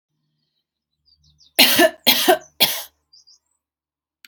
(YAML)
three_cough_length: 4.3 s
three_cough_amplitude: 32768
three_cough_signal_mean_std_ratio: 0.33
survey_phase: beta (2021-08-13 to 2022-03-07)
age: 45-64
gender: Female
wearing_mask: 'No'
symptom_none: true
smoker_status: Ex-smoker
respiratory_condition_asthma: false
respiratory_condition_other: false
recruitment_source: REACT
submission_delay: 4 days
covid_test_result: Negative
covid_test_method: RT-qPCR
influenza_a_test_result: Negative
influenza_b_test_result: Negative